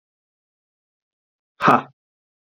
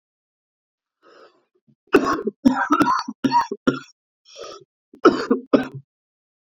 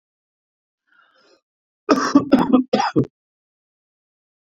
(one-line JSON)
{"exhalation_length": "2.6 s", "exhalation_amplitude": 28278, "exhalation_signal_mean_std_ratio": 0.2, "cough_length": "6.6 s", "cough_amplitude": 28662, "cough_signal_mean_std_ratio": 0.37, "three_cough_length": "4.4 s", "three_cough_amplitude": 32767, "three_cough_signal_mean_std_ratio": 0.33, "survey_phase": "beta (2021-08-13 to 2022-03-07)", "age": "18-44", "gender": "Male", "wearing_mask": "No", "symptom_cough_any": true, "symptom_runny_or_blocked_nose": true, "symptom_shortness_of_breath": true, "symptom_sore_throat": true, "symptom_fatigue": true, "symptom_headache": true, "symptom_change_to_sense_of_smell_or_taste": true, "symptom_loss_of_taste": true, "smoker_status": "Ex-smoker", "respiratory_condition_asthma": true, "respiratory_condition_other": false, "recruitment_source": "Test and Trace", "submission_delay": "2 days", "covid_test_result": "Positive", "covid_test_method": "RT-qPCR", "covid_ct_value": 23.2, "covid_ct_gene": "ORF1ab gene"}